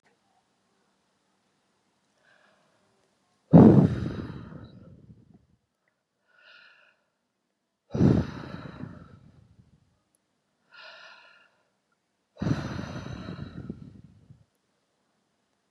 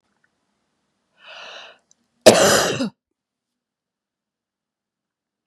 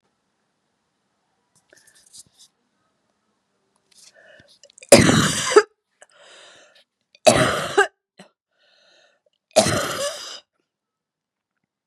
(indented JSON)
{
  "exhalation_length": "15.7 s",
  "exhalation_amplitude": 26770,
  "exhalation_signal_mean_std_ratio": 0.22,
  "cough_length": "5.5 s",
  "cough_amplitude": 32768,
  "cough_signal_mean_std_ratio": 0.24,
  "three_cough_length": "11.9 s",
  "three_cough_amplitude": 32768,
  "three_cough_signal_mean_std_ratio": 0.26,
  "survey_phase": "beta (2021-08-13 to 2022-03-07)",
  "age": "45-64",
  "gender": "Female",
  "wearing_mask": "No",
  "symptom_none": true,
  "smoker_status": "Never smoked",
  "respiratory_condition_asthma": false,
  "respiratory_condition_other": false,
  "recruitment_source": "REACT",
  "submission_delay": "1 day",
  "covid_test_result": "Negative",
  "covid_test_method": "RT-qPCR",
  "influenza_a_test_result": "Negative",
  "influenza_b_test_result": "Negative"
}